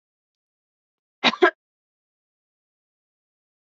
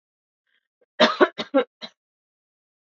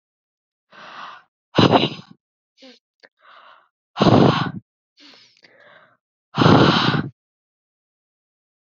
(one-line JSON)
{"cough_length": "3.7 s", "cough_amplitude": 24726, "cough_signal_mean_std_ratio": 0.15, "three_cough_length": "3.0 s", "three_cough_amplitude": 26282, "three_cough_signal_mean_std_ratio": 0.25, "exhalation_length": "8.7 s", "exhalation_amplitude": 27539, "exhalation_signal_mean_std_ratio": 0.33, "survey_phase": "beta (2021-08-13 to 2022-03-07)", "age": "18-44", "gender": "Female", "wearing_mask": "No", "symptom_none": true, "smoker_status": "Never smoked", "respiratory_condition_asthma": false, "respiratory_condition_other": false, "recruitment_source": "REACT", "submission_delay": "1 day", "covid_test_result": "Negative", "covid_test_method": "RT-qPCR", "influenza_a_test_result": "Negative", "influenza_b_test_result": "Negative"}